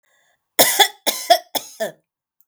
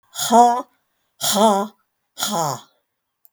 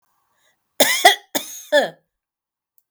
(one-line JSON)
{"three_cough_length": "2.5 s", "three_cough_amplitude": 32768, "three_cough_signal_mean_std_ratio": 0.36, "exhalation_length": "3.3 s", "exhalation_amplitude": 30445, "exhalation_signal_mean_std_ratio": 0.45, "cough_length": "2.9 s", "cough_amplitude": 32768, "cough_signal_mean_std_ratio": 0.33, "survey_phase": "beta (2021-08-13 to 2022-03-07)", "age": "65+", "gender": "Female", "wearing_mask": "No", "symptom_none": true, "smoker_status": "Never smoked", "respiratory_condition_asthma": true, "respiratory_condition_other": false, "recruitment_source": "REACT", "submission_delay": "1 day", "covid_test_result": "Negative", "covid_test_method": "RT-qPCR"}